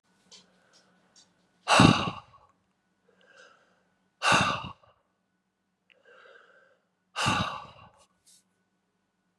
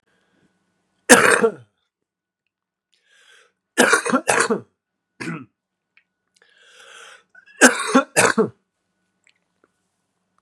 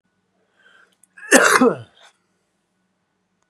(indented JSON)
{
  "exhalation_length": "9.4 s",
  "exhalation_amplitude": 24662,
  "exhalation_signal_mean_std_ratio": 0.26,
  "three_cough_length": "10.4 s",
  "three_cough_amplitude": 32768,
  "three_cough_signal_mean_std_ratio": 0.3,
  "cough_length": "3.5 s",
  "cough_amplitude": 32768,
  "cough_signal_mean_std_ratio": 0.28,
  "survey_phase": "beta (2021-08-13 to 2022-03-07)",
  "age": "18-44",
  "gender": "Male",
  "wearing_mask": "No",
  "symptom_cough_any": true,
  "symptom_runny_or_blocked_nose": true,
  "symptom_fatigue": true,
  "symptom_fever_high_temperature": true,
  "symptom_headache": true,
  "symptom_onset": "2 days",
  "smoker_status": "Never smoked",
  "respiratory_condition_asthma": true,
  "respiratory_condition_other": false,
  "recruitment_source": "Test and Trace",
  "submission_delay": "1 day",
  "covid_test_result": "Positive",
  "covid_test_method": "RT-qPCR"
}